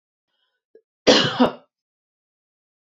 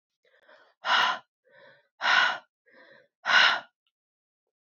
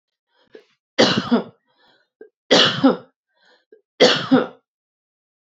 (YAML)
cough_length: 2.8 s
cough_amplitude: 30879
cough_signal_mean_std_ratio: 0.28
exhalation_length: 4.8 s
exhalation_amplitude: 13558
exhalation_signal_mean_std_ratio: 0.36
three_cough_length: 5.5 s
three_cough_amplitude: 29783
three_cough_signal_mean_std_ratio: 0.36
survey_phase: beta (2021-08-13 to 2022-03-07)
age: 18-44
gender: Female
wearing_mask: 'No'
symptom_cough_any: true
symptom_runny_or_blocked_nose: true
symptom_onset: 4 days
smoker_status: Never smoked
respiratory_condition_asthma: false
respiratory_condition_other: false
recruitment_source: REACT
submission_delay: 3 days
covid_test_result: Negative
covid_test_method: RT-qPCR